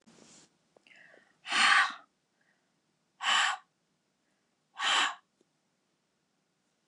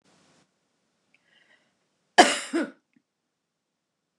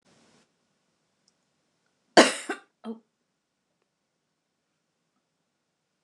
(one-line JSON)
{"exhalation_length": "6.9 s", "exhalation_amplitude": 9224, "exhalation_signal_mean_std_ratio": 0.32, "cough_length": "4.2 s", "cough_amplitude": 29203, "cough_signal_mean_std_ratio": 0.18, "three_cough_length": "6.0 s", "three_cough_amplitude": 29177, "three_cough_signal_mean_std_ratio": 0.13, "survey_phase": "beta (2021-08-13 to 2022-03-07)", "age": "65+", "gender": "Female", "wearing_mask": "No", "symptom_cough_any": true, "symptom_runny_or_blocked_nose": true, "symptom_onset": "11 days", "smoker_status": "Ex-smoker", "respiratory_condition_asthma": false, "respiratory_condition_other": false, "recruitment_source": "REACT", "submission_delay": "1 day", "covid_test_result": "Negative", "covid_test_method": "RT-qPCR", "influenza_a_test_result": "Negative", "influenza_b_test_result": "Negative"}